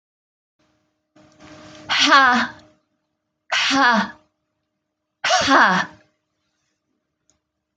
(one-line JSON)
{"exhalation_length": "7.8 s", "exhalation_amplitude": 27679, "exhalation_signal_mean_std_ratio": 0.38, "survey_phase": "alpha (2021-03-01 to 2021-08-12)", "age": "18-44", "gender": "Female", "wearing_mask": "No", "symptom_none": true, "symptom_onset": "12 days", "smoker_status": "Ex-smoker", "respiratory_condition_asthma": false, "respiratory_condition_other": true, "recruitment_source": "REACT", "submission_delay": "1 day", "covid_test_result": "Negative", "covid_test_method": "RT-qPCR"}